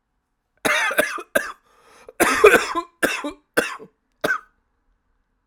{
  "cough_length": "5.5 s",
  "cough_amplitude": 32768,
  "cough_signal_mean_std_ratio": 0.39,
  "survey_phase": "alpha (2021-03-01 to 2021-08-12)",
  "age": "18-44",
  "gender": "Male",
  "wearing_mask": "No",
  "symptom_cough_any": true,
  "symptom_abdominal_pain": true,
  "symptom_diarrhoea": true,
  "symptom_fatigue": true,
  "symptom_fever_high_temperature": true,
  "symptom_change_to_sense_of_smell_or_taste": true,
  "symptom_loss_of_taste": true,
  "smoker_status": "Never smoked",
  "respiratory_condition_asthma": false,
  "respiratory_condition_other": false,
  "recruitment_source": "Test and Trace",
  "submission_delay": "2 days",
  "covid_test_result": "Positive",
  "covid_test_method": "RT-qPCR",
  "covid_ct_value": 14.1,
  "covid_ct_gene": "ORF1ab gene",
  "covid_ct_mean": 14.5,
  "covid_viral_load": "18000000 copies/ml",
  "covid_viral_load_category": "High viral load (>1M copies/ml)"
}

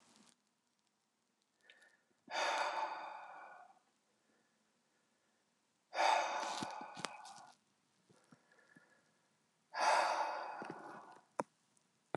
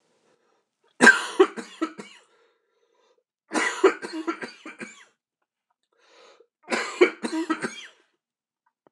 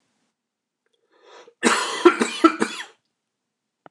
{
  "exhalation_length": "12.2 s",
  "exhalation_amplitude": 4298,
  "exhalation_signal_mean_std_ratio": 0.39,
  "three_cough_length": "8.9 s",
  "three_cough_amplitude": 26028,
  "three_cough_signal_mean_std_ratio": 0.29,
  "cough_length": "3.9 s",
  "cough_amplitude": 26028,
  "cough_signal_mean_std_ratio": 0.31,
  "survey_phase": "beta (2021-08-13 to 2022-03-07)",
  "age": "45-64",
  "gender": "Male",
  "wearing_mask": "No",
  "symptom_cough_any": true,
  "symptom_fatigue": true,
  "symptom_onset": "8 days",
  "smoker_status": "Never smoked",
  "respiratory_condition_asthma": false,
  "respiratory_condition_other": false,
  "recruitment_source": "REACT",
  "submission_delay": "1 day",
  "covid_test_result": "Positive",
  "covid_test_method": "RT-qPCR",
  "covid_ct_value": 31.0,
  "covid_ct_gene": "N gene"
}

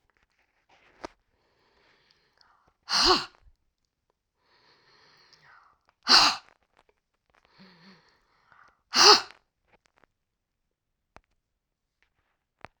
{
  "exhalation_length": "12.8 s",
  "exhalation_amplitude": 28465,
  "exhalation_signal_mean_std_ratio": 0.2,
  "survey_phase": "alpha (2021-03-01 to 2021-08-12)",
  "age": "65+",
  "gender": "Female",
  "wearing_mask": "No",
  "symptom_cough_any": true,
  "symptom_abdominal_pain": true,
  "symptom_headache": true,
  "symptom_change_to_sense_of_smell_or_taste": true,
  "smoker_status": "Never smoked",
  "respiratory_condition_asthma": false,
  "respiratory_condition_other": false,
  "recruitment_source": "Test and Trace",
  "submission_delay": "2 days",
  "covid_test_result": "Positive",
  "covid_test_method": "RT-qPCR"
}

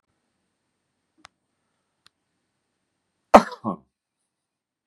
{
  "cough_length": "4.9 s",
  "cough_amplitude": 32768,
  "cough_signal_mean_std_ratio": 0.11,
  "survey_phase": "beta (2021-08-13 to 2022-03-07)",
  "age": "65+",
  "gender": "Male",
  "wearing_mask": "No",
  "symptom_none": true,
  "smoker_status": "Ex-smoker",
  "respiratory_condition_asthma": false,
  "respiratory_condition_other": false,
  "recruitment_source": "REACT",
  "submission_delay": "2 days",
  "covid_test_result": "Negative",
  "covid_test_method": "RT-qPCR",
  "influenza_a_test_result": "Negative",
  "influenza_b_test_result": "Negative"
}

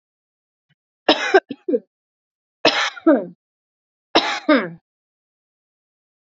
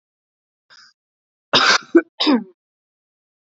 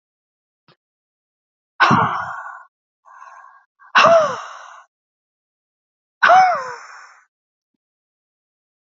{
  "three_cough_length": "6.3 s",
  "three_cough_amplitude": 29298,
  "three_cough_signal_mean_std_ratio": 0.32,
  "cough_length": "3.4 s",
  "cough_amplitude": 29006,
  "cough_signal_mean_std_ratio": 0.31,
  "exhalation_length": "8.9 s",
  "exhalation_amplitude": 28727,
  "exhalation_signal_mean_std_ratio": 0.32,
  "survey_phase": "beta (2021-08-13 to 2022-03-07)",
  "age": "18-44",
  "gender": "Female",
  "wearing_mask": "No",
  "symptom_cough_any": true,
  "symptom_new_continuous_cough": true,
  "symptom_runny_or_blocked_nose": true,
  "symptom_sore_throat": true,
  "symptom_fatigue": true,
  "symptom_headache": true,
  "symptom_onset": "2 days",
  "smoker_status": "Ex-smoker",
  "respiratory_condition_asthma": true,
  "respiratory_condition_other": false,
  "recruitment_source": "Test and Trace",
  "submission_delay": "1 day",
  "covid_test_result": "Positive",
  "covid_test_method": "RT-qPCR",
  "covid_ct_value": 19.2,
  "covid_ct_gene": "ORF1ab gene",
  "covid_ct_mean": 20.1,
  "covid_viral_load": "260000 copies/ml",
  "covid_viral_load_category": "Low viral load (10K-1M copies/ml)"
}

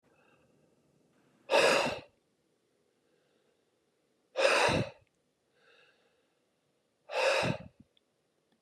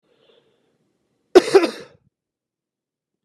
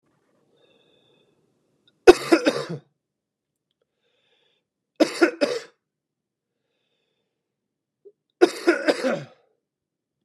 {
  "exhalation_length": "8.6 s",
  "exhalation_amplitude": 7641,
  "exhalation_signal_mean_std_ratio": 0.33,
  "cough_length": "3.2 s",
  "cough_amplitude": 32768,
  "cough_signal_mean_std_ratio": 0.2,
  "three_cough_length": "10.2 s",
  "three_cough_amplitude": 32768,
  "three_cough_signal_mean_std_ratio": 0.23,
  "survey_phase": "beta (2021-08-13 to 2022-03-07)",
  "age": "45-64",
  "gender": "Male",
  "wearing_mask": "No",
  "symptom_cough_any": true,
  "symptom_runny_or_blocked_nose": true,
  "smoker_status": "Never smoked",
  "respiratory_condition_asthma": false,
  "respiratory_condition_other": false,
  "recruitment_source": "Test and Trace",
  "submission_delay": "2 days",
  "covid_test_result": "Positive",
  "covid_test_method": "LFT"
}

